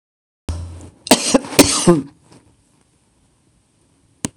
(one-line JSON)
{"cough_length": "4.4 s", "cough_amplitude": 26028, "cough_signal_mean_std_ratio": 0.32, "survey_phase": "beta (2021-08-13 to 2022-03-07)", "age": "65+", "gender": "Female", "wearing_mask": "No", "symptom_none": true, "smoker_status": "Ex-smoker", "respiratory_condition_asthma": false, "respiratory_condition_other": false, "recruitment_source": "REACT", "submission_delay": "3 days", "covid_test_result": "Negative", "covid_test_method": "RT-qPCR", "influenza_a_test_result": "Negative", "influenza_b_test_result": "Negative"}